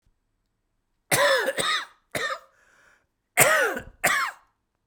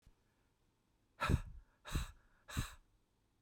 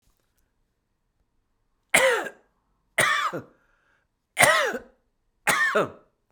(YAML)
cough_length: 4.9 s
cough_amplitude: 23406
cough_signal_mean_std_ratio: 0.46
exhalation_length: 3.4 s
exhalation_amplitude: 3223
exhalation_signal_mean_std_ratio: 0.33
three_cough_length: 6.3 s
three_cough_amplitude: 32767
three_cough_signal_mean_std_ratio: 0.38
survey_phase: beta (2021-08-13 to 2022-03-07)
age: 45-64
gender: Male
wearing_mask: 'No'
symptom_cough_any: true
symptom_runny_or_blocked_nose: true
symptom_shortness_of_breath: true
symptom_sore_throat: true
symptom_fatigue: true
symptom_fever_high_temperature: true
symptom_headache: true
symptom_change_to_sense_of_smell_or_taste: true
symptom_onset: 3 days
smoker_status: Never smoked
respiratory_condition_asthma: false
respiratory_condition_other: false
recruitment_source: Test and Trace
submission_delay: 2 days
covid_test_result: Positive
covid_test_method: ePCR